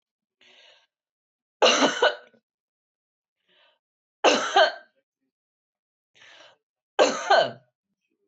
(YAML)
three_cough_length: 8.3 s
three_cough_amplitude: 17218
three_cough_signal_mean_std_ratio: 0.31
survey_phase: beta (2021-08-13 to 2022-03-07)
age: 45-64
gender: Female
wearing_mask: 'No'
symptom_sore_throat: true
smoker_status: Never smoked
respiratory_condition_asthma: false
respiratory_condition_other: false
recruitment_source: Test and Trace
submission_delay: 1 day
covid_test_result: Positive
covid_test_method: RT-qPCR
covid_ct_value: 18.8
covid_ct_gene: ORF1ab gene
covid_ct_mean: 19.3
covid_viral_load: 480000 copies/ml
covid_viral_load_category: Low viral load (10K-1M copies/ml)